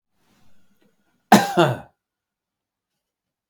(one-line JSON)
{"cough_length": "3.5 s", "cough_amplitude": 32768, "cough_signal_mean_std_ratio": 0.23, "survey_phase": "beta (2021-08-13 to 2022-03-07)", "age": "65+", "gender": "Male", "wearing_mask": "No", "symptom_none": true, "smoker_status": "Never smoked", "respiratory_condition_asthma": false, "respiratory_condition_other": false, "recruitment_source": "REACT", "submission_delay": "0 days", "covid_test_result": "Negative", "covid_test_method": "RT-qPCR"}